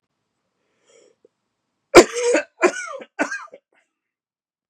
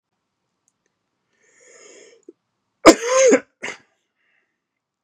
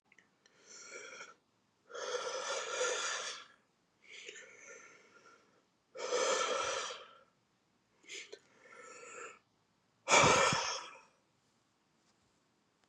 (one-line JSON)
{"three_cough_length": "4.7 s", "three_cough_amplitude": 32768, "three_cough_signal_mean_std_ratio": 0.25, "cough_length": "5.0 s", "cough_amplitude": 32768, "cough_signal_mean_std_ratio": 0.23, "exhalation_length": "12.9 s", "exhalation_amplitude": 7223, "exhalation_signal_mean_std_ratio": 0.39, "survey_phase": "beta (2021-08-13 to 2022-03-07)", "age": "45-64", "gender": "Male", "wearing_mask": "No", "symptom_cough_any": true, "symptom_runny_or_blocked_nose": true, "symptom_shortness_of_breath": true, "symptom_fatigue": true, "symptom_headache": true, "symptom_change_to_sense_of_smell_or_taste": true, "symptom_loss_of_taste": true, "symptom_onset": "6 days", "smoker_status": "Ex-smoker", "respiratory_condition_asthma": false, "respiratory_condition_other": false, "recruitment_source": "Test and Trace", "submission_delay": "2 days", "covid_test_result": "Positive", "covid_test_method": "RT-qPCR"}